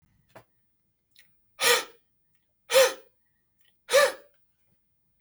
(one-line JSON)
{"exhalation_length": "5.2 s", "exhalation_amplitude": 15178, "exhalation_signal_mean_std_ratio": 0.28, "survey_phase": "beta (2021-08-13 to 2022-03-07)", "age": "45-64", "gender": "Male", "wearing_mask": "No", "symptom_none": true, "smoker_status": "Never smoked", "respiratory_condition_asthma": false, "respiratory_condition_other": false, "recruitment_source": "REACT", "submission_delay": "1 day", "covid_test_result": "Negative", "covid_test_method": "RT-qPCR", "influenza_a_test_result": "Negative", "influenza_b_test_result": "Negative"}